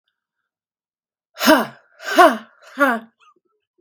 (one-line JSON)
{"exhalation_length": "3.8 s", "exhalation_amplitude": 32767, "exhalation_signal_mean_std_ratio": 0.32, "survey_phase": "beta (2021-08-13 to 2022-03-07)", "age": "18-44", "gender": "Female", "wearing_mask": "No", "symptom_runny_or_blocked_nose": true, "smoker_status": "Current smoker (1 to 10 cigarettes per day)", "respiratory_condition_asthma": false, "respiratory_condition_other": false, "recruitment_source": "REACT", "submission_delay": "1 day", "covid_test_result": "Negative", "covid_test_method": "RT-qPCR"}